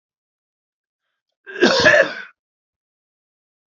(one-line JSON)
{"cough_length": "3.7 s", "cough_amplitude": 30277, "cough_signal_mean_std_ratio": 0.3, "survey_phase": "alpha (2021-03-01 to 2021-08-12)", "age": "65+", "gender": "Male", "wearing_mask": "No", "symptom_none": true, "smoker_status": "Never smoked", "respiratory_condition_asthma": false, "respiratory_condition_other": false, "recruitment_source": "REACT", "submission_delay": "1 day", "covid_test_result": "Negative", "covid_test_method": "RT-qPCR"}